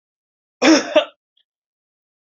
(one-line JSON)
{"cough_length": "2.3 s", "cough_amplitude": 29856, "cough_signal_mean_std_ratio": 0.29, "survey_phase": "beta (2021-08-13 to 2022-03-07)", "age": "45-64", "gender": "Male", "wearing_mask": "No", "symptom_cough_any": true, "symptom_runny_or_blocked_nose": true, "symptom_sore_throat": true, "symptom_fatigue": true, "symptom_headache": true, "symptom_onset": "3 days", "smoker_status": "Never smoked", "respiratory_condition_asthma": false, "respiratory_condition_other": false, "recruitment_source": "Test and Trace", "submission_delay": "1 day", "covid_test_result": "Positive", "covid_test_method": "RT-qPCR", "covid_ct_value": 12.7, "covid_ct_gene": "N gene", "covid_ct_mean": 13.2, "covid_viral_load": "48000000 copies/ml", "covid_viral_load_category": "High viral load (>1M copies/ml)"}